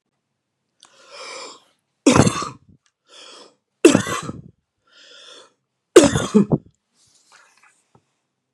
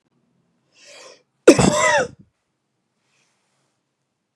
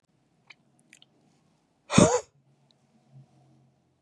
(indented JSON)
{
  "three_cough_length": "8.5 s",
  "three_cough_amplitude": 32768,
  "three_cough_signal_mean_std_ratio": 0.26,
  "cough_length": "4.4 s",
  "cough_amplitude": 32768,
  "cough_signal_mean_std_ratio": 0.26,
  "exhalation_length": "4.0 s",
  "exhalation_amplitude": 21065,
  "exhalation_signal_mean_std_ratio": 0.2,
  "survey_phase": "beta (2021-08-13 to 2022-03-07)",
  "age": "45-64",
  "gender": "Male",
  "wearing_mask": "No",
  "symptom_none": true,
  "smoker_status": "Ex-smoker",
  "respiratory_condition_asthma": false,
  "respiratory_condition_other": false,
  "recruitment_source": "REACT",
  "submission_delay": "1 day",
  "covid_test_result": "Negative",
  "covid_test_method": "RT-qPCR",
  "influenza_a_test_result": "Negative",
  "influenza_b_test_result": "Negative"
}